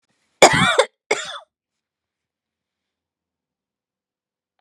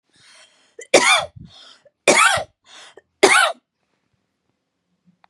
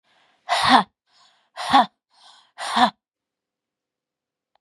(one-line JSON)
{"cough_length": "4.6 s", "cough_amplitude": 32768, "cough_signal_mean_std_ratio": 0.23, "three_cough_length": "5.3 s", "three_cough_amplitude": 32768, "three_cough_signal_mean_std_ratio": 0.34, "exhalation_length": "4.6 s", "exhalation_amplitude": 31473, "exhalation_signal_mean_std_ratio": 0.31, "survey_phase": "beta (2021-08-13 to 2022-03-07)", "age": "45-64", "gender": "Female", "wearing_mask": "No", "symptom_none": true, "smoker_status": "Never smoked", "respiratory_condition_asthma": true, "respiratory_condition_other": true, "recruitment_source": "REACT", "submission_delay": "1 day", "covid_test_result": "Negative", "covid_test_method": "RT-qPCR", "influenza_a_test_result": "Negative", "influenza_b_test_result": "Negative"}